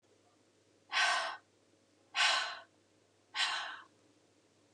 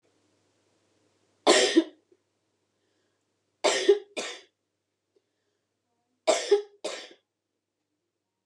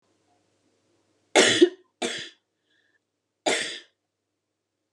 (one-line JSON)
{"exhalation_length": "4.7 s", "exhalation_amplitude": 4526, "exhalation_signal_mean_std_ratio": 0.41, "three_cough_length": "8.5 s", "three_cough_amplitude": 17040, "three_cough_signal_mean_std_ratio": 0.27, "cough_length": "4.9 s", "cough_amplitude": 20728, "cough_signal_mean_std_ratio": 0.27, "survey_phase": "beta (2021-08-13 to 2022-03-07)", "age": "18-44", "gender": "Female", "wearing_mask": "No", "symptom_cough_any": true, "symptom_onset": "12 days", "smoker_status": "Current smoker (11 or more cigarettes per day)", "respiratory_condition_asthma": false, "respiratory_condition_other": false, "recruitment_source": "REACT", "submission_delay": "1 day", "covid_test_result": "Negative", "covid_test_method": "RT-qPCR"}